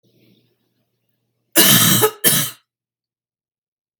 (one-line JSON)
{"cough_length": "4.0 s", "cough_amplitude": 32768, "cough_signal_mean_std_ratio": 0.36, "survey_phase": "beta (2021-08-13 to 2022-03-07)", "age": "45-64", "gender": "Female", "wearing_mask": "No", "symptom_shortness_of_breath": true, "symptom_fatigue": true, "smoker_status": "Never smoked", "respiratory_condition_asthma": false, "respiratory_condition_other": true, "recruitment_source": "REACT", "submission_delay": "3 days", "covid_test_result": "Negative", "covid_test_method": "RT-qPCR", "influenza_a_test_result": "Negative", "influenza_b_test_result": "Negative"}